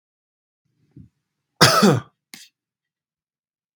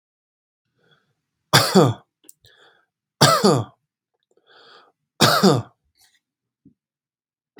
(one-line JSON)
{"cough_length": "3.8 s", "cough_amplitude": 32766, "cough_signal_mean_std_ratio": 0.25, "three_cough_length": "7.6 s", "three_cough_amplitude": 32768, "three_cough_signal_mean_std_ratio": 0.3, "survey_phase": "beta (2021-08-13 to 2022-03-07)", "age": "18-44", "gender": "Male", "wearing_mask": "No", "symptom_sore_throat": true, "symptom_fatigue": true, "symptom_onset": "13 days", "smoker_status": "Never smoked", "respiratory_condition_asthma": false, "respiratory_condition_other": false, "recruitment_source": "REACT", "submission_delay": "2 days", "covid_test_result": "Negative", "covid_test_method": "RT-qPCR"}